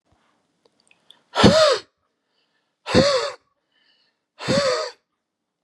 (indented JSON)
{
  "exhalation_length": "5.6 s",
  "exhalation_amplitude": 32552,
  "exhalation_signal_mean_std_ratio": 0.37,
  "survey_phase": "beta (2021-08-13 to 2022-03-07)",
  "age": "45-64",
  "gender": "Male",
  "wearing_mask": "No",
  "symptom_none": true,
  "smoker_status": "Never smoked",
  "respiratory_condition_asthma": false,
  "respiratory_condition_other": false,
  "recruitment_source": "REACT",
  "submission_delay": "3 days",
  "covid_test_result": "Negative",
  "covid_test_method": "RT-qPCR",
  "influenza_a_test_result": "Negative",
  "influenza_b_test_result": "Negative"
}